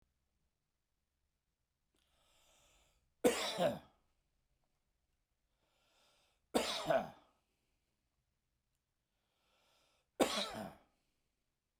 {"three_cough_length": "11.8 s", "three_cough_amplitude": 5385, "three_cough_signal_mean_std_ratio": 0.25, "survey_phase": "beta (2021-08-13 to 2022-03-07)", "age": "45-64", "gender": "Male", "wearing_mask": "No", "symptom_none": true, "smoker_status": "Never smoked", "respiratory_condition_asthma": false, "respiratory_condition_other": true, "recruitment_source": "REACT", "submission_delay": "1 day", "covid_test_result": "Negative", "covid_test_method": "RT-qPCR"}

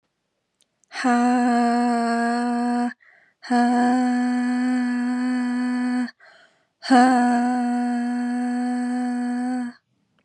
{"exhalation_length": "10.2 s", "exhalation_amplitude": 19906, "exhalation_signal_mean_std_ratio": 0.9, "survey_phase": "beta (2021-08-13 to 2022-03-07)", "age": "18-44", "gender": "Female", "wearing_mask": "No", "symptom_none": true, "smoker_status": "Never smoked", "respiratory_condition_asthma": false, "respiratory_condition_other": false, "recruitment_source": "REACT", "submission_delay": "2 days", "covid_test_result": "Negative", "covid_test_method": "RT-qPCR", "influenza_a_test_result": "Negative", "influenza_b_test_result": "Negative"}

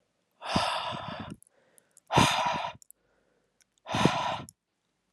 {"exhalation_length": "5.1 s", "exhalation_amplitude": 16279, "exhalation_signal_mean_std_ratio": 0.45, "survey_phase": "alpha (2021-03-01 to 2021-08-12)", "age": "18-44", "gender": "Male", "wearing_mask": "No", "symptom_cough_any": true, "symptom_fatigue": true, "symptom_onset": "6 days", "smoker_status": "Never smoked", "respiratory_condition_asthma": false, "respiratory_condition_other": false, "recruitment_source": "Test and Trace", "submission_delay": "3 days", "covid_test_result": "Positive", "covid_test_method": "RT-qPCR"}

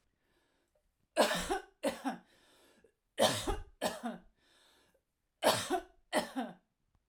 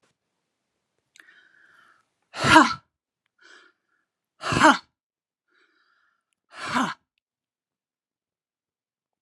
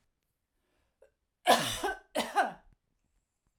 {"three_cough_length": "7.1 s", "three_cough_amplitude": 6599, "three_cough_signal_mean_std_ratio": 0.4, "exhalation_length": "9.2 s", "exhalation_amplitude": 29755, "exhalation_signal_mean_std_ratio": 0.22, "cough_length": "3.6 s", "cough_amplitude": 10589, "cough_signal_mean_std_ratio": 0.33, "survey_phase": "alpha (2021-03-01 to 2021-08-12)", "age": "45-64", "gender": "Female", "wearing_mask": "No", "symptom_none": true, "smoker_status": "Ex-smoker", "respiratory_condition_asthma": false, "respiratory_condition_other": false, "recruitment_source": "REACT", "submission_delay": "1 day", "covid_test_result": "Negative", "covid_test_method": "RT-qPCR"}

